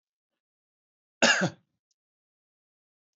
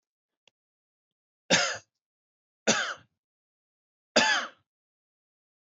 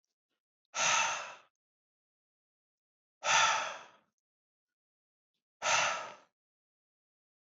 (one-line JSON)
{"cough_length": "3.2 s", "cough_amplitude": 16160, "cough_signal_mean_std_ratio": 0.22, "three_cough_length": "5.6 s", "three_cough_amplitude": 16643, "three_cough_signal_mean_std_ratio": 0.28, "exhalation_length": "7.5 s", "exhalation_amplitude": 6272, "exhalation_signal_mean_std_ratio": 0.34, "survey_phase": "beta (2021-08-13 to 2022-03-07)", "age": "18-44", "gender": "Male", "wearing_mask": "No", "symptom_none": true, "symptom_onset": "13 days", "smoker_status": "Ex-smoker", "respiratory_condition_asthma": false, "respiratory_condition_other": false, "recruitment_source": "REACT", "submission_delay": "3 days", "covid_test_result": "Negative", "covid_test_method": "RT-qPCR", "influenza_a_test_result": "Negative", "influenza_b_test_result": "Negative"}